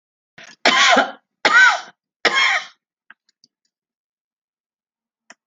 {"cough_length": "5.5 s", "cough_amplitude": 31110, "cough_signal_mean_std_ratio": 0.36, "survey_phase": "alpha (2021-03-01 to 2021-08-12)", "age": "65+", "gender": "Female", "wearing_mask": "No", "symptom_none": true, "smoker_status": "Never smoked", "respiratory_condition_asthma": false, "respiratory_condition_other": false, "recruitment_source": "REACT", "submission_delay": "31 days", "covid_test_result": "Negative", "covid_test_method": "RT-qPCR"}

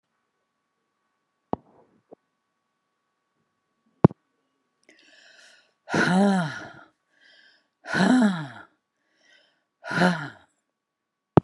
{"exhalation_length": "11.4 s", "exhalation_amplitude": 32730, "exhalation_signal_mean_std_ratio": 0.28, "survey_phase": "beta (2021-08-13 to 2022-03-07)", "age": "65+", "gender": "Female", "wearing_mask": "No", "symptom_none": true, "smoker_status": "Current smoker (1 to 10 cigarettes per day)", "respiratory_condition_asthma": false, "respiratory_condition_other": false, "recruitment_source": "REACT", "submission_delay": "1 day", "covid_test_result": "Negative", "covid_test_method": "RT-qPCR"}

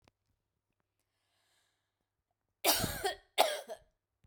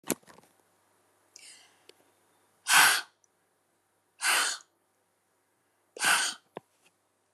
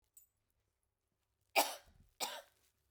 {"cough_length": "4.3 s", "cough_amplitude": 10892, "cough_signal_mean_std_ratio": 0.29, "exhalation_length": "7.3 s", "exhalation_amplitude": 17686, "exhalation_signal_mean_std_ratio": 0.29, "three_cough_length": "2.9 s", "three_cough_amplitude": 4845, "three_cough_signal_mean_std_ratio": 0.23, "survey_phase": "beta (2021-08-13 to 2022-03-07)", "age": "45-64", "gender": "Female", "wearing_mask": "No", "symptom_headache": true, "smoker_status": "Never smoked", "respiratory_condition_asthma": false, "respiratory_condition_other": false, "recruitment_source": "REACT", "submission_delay": "1 day", "covid_test_result": "Negative", "covid_test_method": "RT-qPCR"}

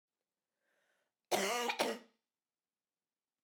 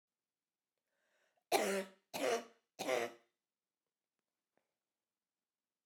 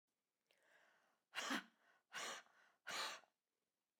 {"cough_length": "3.4 s", "cough_amplitude": 4518, "cough_signal_mean_std_ratio": 0.34, "three_cough_length": "5.9 s", "three_cough_amplitude": 3691, "three_cough_signal_mean_std_ratio": 0.3, "exhalation_length": "4.0 s", "exhalation_amplitude": 1057, "exhalation_signal_mean_std_ratio": 0.39, "survey_phase": "beta (2021-08-13 to 2022-03-07)", "age": "45-64", "gender": "Female", "wearing_mask": "No", "symptom_none": true, "smoker_status": "Never smoked", "respiratory_condition_asthma": true, "respiratory_condition_other": false, "recruitment_source": "REACT", "submission_delay": "1 day", "covid_test_result": "Negative", "covid_test_method": "RT-qPCR", "influenza_a_test_result": "Negative", "influenza_b_test_result": "Negative"}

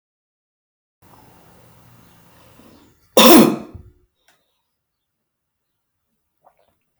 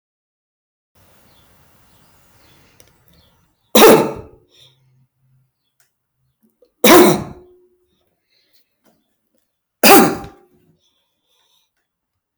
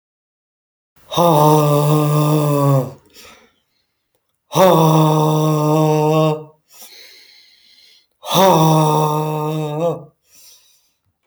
{"cough_length": "7.0 s", "cough_amplitude": 32768, "cough_signal_mean_std_ratio": 0.2, "three_cough_length": "12.4 s", "three_cough_amplitude": 32768, "three_cough_signal_mean_std_ratio": 0.24, "exhalation_length": "11.3 s", "exhalation_amplitude": 32768, "exhalation_signal_mean_std_ratio": 0.61, "survey_phase": "alpha (2021-03-01 to 2021-08-12)", "age": "45-64", "gender": "Male", "wearing_mask": "No", "symptom_cough_any": true, "symptom_shortness_of_breath": true, "symptom_fatigue": true, "symptom_onset": "8 days", "smoker_status": "Never smoked", "respiratory_condition_asthma": false, "respiratory_condition_other": false, "recruitment_source": "REACT", "submission_delay": "2 days", "covid_test_result": "Negative", "covid_test_method": "RT-qPCR"}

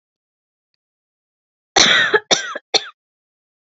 {"cough_length": "3.8 s", "cough_amplitude": 29754, "cough_signal_mean_std_ratio": 0.32, "survey_phase": "beta (2021-08-13 to 2022-03-07)", "age": "45-64", "gender": "Female", "wearing_mask": "No", "symptom_none": true, "smoker_status": "Never smoked", "respiratory_condition_asthma": false, "respiratory_condition_other": false, "recruitment_source": "REACT", "submission_delay": "1 day", "covid_test_result": "Negative", "covid_test_method": "RT-qPCR", "influenza_a_test_result": "Negative", "influenza_b_test_result": "Negative"}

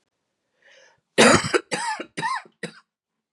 {"three_cough_length": "3.3 s", "three_cough_amplitude": 25434, "three_cough_signal_mean_std_ratio": 0.35, "survey_phase": "beta (2021-08-13 to 2022-03-07)", "age": "18-44", "gender": "Female", "wearing_mask": "No", "symptom_cough_any": true, "symptom_runny_or_blocked_nose": true, "symptom_shortness_of_breath": true, "symptom_abdominal_pain": true, "symptom_fatigue": true, "symptom_loss_of_taste": true, "smoker_status": "Never smoked", "respiratory_condition_asthma": false, "respiratory_condition_other": false, "recruitment_source": "Test and Trace", "submission_delay": "2 days", "covid_test_result": "Positive", "covid_test_method": "RT-qPCR", "covid_ct_value": 22.9, "covid_ct_gene": "N gene", "covid_ct_mean": 24.1, "covid_viral_load": "13000 copies/ml", "covid_viral_load_category": "Low viral load (10K-1M copies/ml)"}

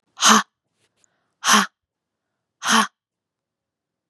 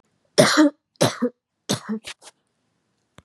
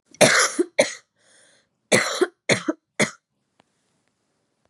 {"exhalation_length": "4.1 s", "exhalation_amplitude": 31737, "exhalation_signal_mean_std_ratio": 0.3, "three_cough_length": "3.2 s", "three_cough_amplitude": 30778, "three_cough_signal_mean_std_ratio": 0.35, "cough_length": "4.7 s", "cough_amplitude": 32767, "cough_signal_mean_std_ratio": 0.35, "survey_phase": "beta (2021-08-13 to 2022-03-07)", "age": "18-44", "gender": "Female", "wearing_mask": "No", "symptom_cough_any": true, "symptom_runny_or_blocked_nose": true, "symptom_shortness_of_breath": true, "symptom_sore_throat": true, "smoker_status": "Never smoked", "respiratory_condition_asthma": false, "respiratory_condition_other": false, "recruitment_source": "Test and Trace", "submission_delay": "2 days", "covid_test_result": "Positive", "covid_test_method": "RT-qPCR"}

